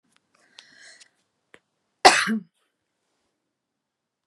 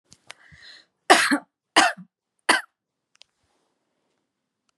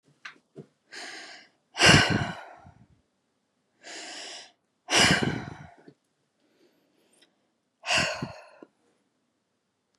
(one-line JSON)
{"cough_length": "4.3 s", "cough_amplitude": 32767, "cough_signal_mean_std_ratio": 0.18, "three_cough_length": "4.8 s", "three_cough_amplitude": 32153, "three_cough_signal_mean_std_ratio": 0.25, "exhalation_length": "10.0 s", "exhalation_amplitude": 23432, "exhalation_signal_mean_std_ratio": 0.3, "survey_phase": "beta (2021-08-13 to 2022-03-07)", "age": "18-44", "gender": "Female", "wearing_mask": "No", "symptom_none": true, "smoker_status": "Never smoked", "respiratory_condition_asthma": false, "respiratory_condition_other": false, "recruitment_source": "REACT", "submission_delay": "1 day", "covid_test_result": "Negative", "covid_test_method": "RT-qPCR", "influenza_a_test_result": "Positive", "influenza_a_ct_value": 36.7, "influenza_b_test_result": "Negative"}